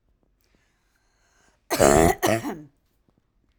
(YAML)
cough_length: 3.6 s
cough_amplitude: 27069
cough_signal_mean_std_ratio: 0.31
survey_phase: alpha (2021-03-01 to 2021-08-12)
age: 45-64
gender: Female
wearing_mask: 'No'
symptom_none: true
smoker_status: Ex-smoker
respiratory_condition_asthma: false
respiratory_condition_other: false
recruitment_source: REACT
submission_delay: 5 days
covid_test_method: RT-qPCR